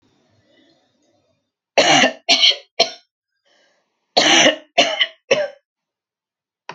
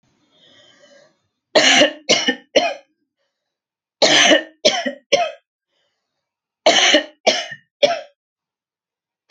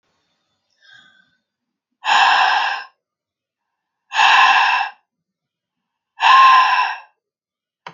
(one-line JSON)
{"cough_length": "6.7 s", "cough_amplitude": 30901, "cough_signal_mean_std_ratio": 0.37, "three_cough_length": "9.3 s", "three_cough_amplitude": 32768, "three_cough_signal_mean_std_ratio": 0.39, "exhalation_length": "7.9 s", "exhalation_amplitude": 29512, "exhalation_signal_mean_std_ratio": 0.44, "survey_phase": "alpha (2021-03-01 to 2021-08-12)", "age": "45-64", "gender": "Female", "wearing_mask": "No", "symptom_none": true, "smoker_status": "Never smoked", "respiratory_condition_asthma": false, "respiratory_condition_other": false, "recruitment_source": "REACT", "submission_delay": "2 days", "covid_test_result": "Negative", "covid_test_method": "RT-qPCR"}